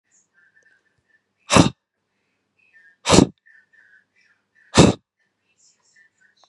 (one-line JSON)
{"exhalation_length": "6.5 s", "exhalation_amplitude": 32768, "exhalation_signal_mean_std_ratio": 0.21, "survey_phase": "beta (2021-08-13 to 2022-03-07)", "age": "18-44", "gender": "Male", "wearing_mask": "No", "symptom_none": true, "symptom_onset": "9 days", "smoker_status": "Never smoked", "respiratory_condition_asthma": false, "respiratory_condition_other": false, "recruitment_source": "REACT", "submission_delay": "1 day", "covid_test_result": "Negative", "covid_test_method": "RT-qPCR", "influenza_a_test_result": "Negative", "influenza_b_test_result": "Negative"}